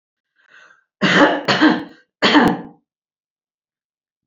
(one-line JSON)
{"cough_length": "4.3 s", "cough_amplitude": 30419, "cough_signal_mean_std_ratio": 0.41, "survey_phase": "beta (2021-08-13 to 2022-03-07)", "age": "65+", "gender": "Female", "wearing_mask": "No", "symptom_none": true, "smoker_status": "Never smoked", "respiratory_condition_asthma": false, "respiratory_condition_other": false, "recruitment_source": "REACT", "submission_delay": "1 day", "covid_test_result": "Negative", "covid_test_method": "RT-qPCR", "influenza_a_test_result": "Negative", "influenza_b_test_result": "Negative"}